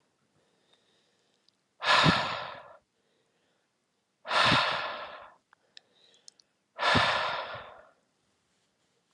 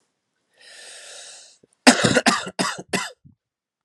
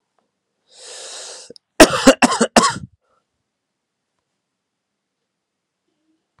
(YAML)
exhalation_length: 9.1 s
exhalation_amplitude: 13061
exhalation_signal_mean_std_ratio: 0.37
cough_length: 3.8 s
cough_amplitude: 32767
cough_signal_mean_std_ratio: 0.33
three_cough_length: 6.4 s
three_cough_amplitude: 32768
three_cough_signal_mean_std_ratio: 0.23
survey_phase: alpha (2021-03-01 to 2021-08-12)
age: 18-44
gender: Male
wearing_mask: 'No'
symptom_cough_any: true
symptom_shortness_of_breath: true
symptom_diarrhoea: true
symptom_fatigue: true
smoker_status: Ex-smoker
respiratory_condition_asthma: false
respiratory_condition_other: false
recruitment_source: Test and Trace
submission_delay: 2 days
covid_test_result: Positive
covid_test_method: RT-qPCR
covid_ct_value: 19.0
covid_ct_gene: ORF1ab gene
covid_ct_mean: 19.3
covid_viral_load: 460000 copies/ml
covid_viral_load_category: Low viral load (10K-1M copies/ml)